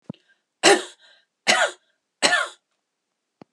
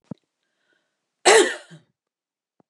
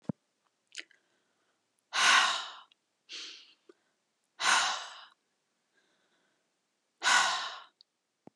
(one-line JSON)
{"three_cough_length": "3.5 s", "three_cough_amplitude": 30689, "three_cough_signal_mean_std_ratio": 0.33, "cough_length": "2.7 s", "cough_amplitude": 30739, "cough_signal_mean_std_ratio": 0.25, "exhalation_length": "8.4 s", "exhalation_amplitude": 9467, "exhalation_signal_mean_std_ratio": 0.33, "survey_phase": "alpha (2021-03-01 to 2021-08-12)", "age": "45-64", "gender": "Female", "wearing_mask": "No", "symptom_none": true, "smoker_status": "Never smoked", "respiratory_condition_asthma": false, "respiratory_condition_other": false, "recruitment_source": "REACT", "submission_delay": "1 day", "covid_test_result": "Negative", "covid_test_method": "RT-qPCR"}